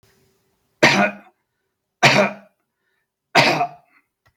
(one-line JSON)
{"three_cough_length": "4.4 s", "three_cough_amplitude": 32767, "three_cough_signal_mean_std_ratio": 0.36, "survey_phase": "beta (2021-08-13 to 2022-03-07)", "age": "45-64", "gender": "Male", "wearing_mask": "No", "symptom_none": true, "smoker_status": "Ex-smoker", "respiratory_condition_asthma": false, "respiratory_condition_other": false, "recruitment_source": "REACT", "submission_delay": "3 days", "covid_test_result": "Negative", "covid_test_method": "RT-qPCR"}